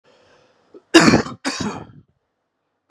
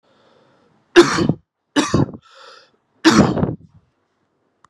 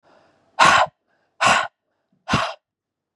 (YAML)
cough_length: 2.9 s
cough_amplitude: 32768
cough_signal_mean_std_ratio: 0.31
three_cough_length: 4.7 s
three_cough_amplitude: 32768
three_cough_signal_mean_std_ratio: 0.35
exhalation_length: 3.2 s
exhalation_amplitude: 30694
exhalation_signal_mean_std_ratio: 0.38
survey_phase: beta (2021-08-13 to 2022-03-07)
age: 18-44
gender: Male
wearing_mask: 'No'
symptom_sore_throat: true
symptom_fatigue: true
symptom_headache: true
symptom_other: true
symptom_onset: 9 days
smoker_status: Never smoked
respiratory_condition_asthma: false
respiratory_condition_other: false
recruitment_source: Test and Trace
submission_delay: 1 day
covid_test_result: Positive
covid_test_method: RT-qPCR